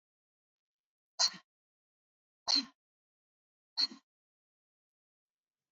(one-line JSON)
{"exhalation_length": "5.7 s", "exhalation_amplitude": 5083, "exhalation_signal_mean_std_ratio": 0.19, "survey_phase": "beta (2021-08-13 to 2022-03-07)", "age": "18-44", "gender": "Female", "wearing_mask": "No", "symptom_none": true, "smoker_status": "Never smoked", "respiratory_condition_asthma": false, "respiratory_condition_other": false, "recruitment_source": "REACT", "submission_delay": "2 days", "covid_test_result": "Negative", "covid_test_method": "RT-qPCR", "influenza_a_test_result": "Negative", "influenza_b_test_result": "Negative"}